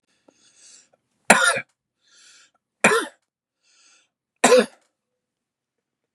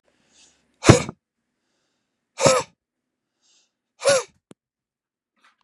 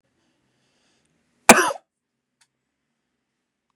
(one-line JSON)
{"three_cough_length": "6.1 s", "three_cough_amplitude": 32768, "three_cough_signal_mean_std_ratio": 0.26, "exhalation_length": "5.6 s", "exhalation_amplitude": 32768, "exhalation_signal_mean_std_ratio": 0.23, "cough_length": "3.8 s", "cough_amplitude": 32768, "cough_signal_mean_std_ratio": 0.15, "survey_phase": "beta (2021-08-13 to 2022-03-07)", "age": "45-64", "gender": "Male", "wearing_mask": "No", "symptom_none": true, "smoker_status": "Never smoked", "respiratory_condition_asthma": false, "respiratory_condition_other": false, "recruitment_source": "REACT", "submission_delay": "2 days", "covid_test_result": "Negative", "covid_test_method": "RT-qPCR", "influenza_a_test_result": "Negative", "influenza_b_test_result": "Negative"}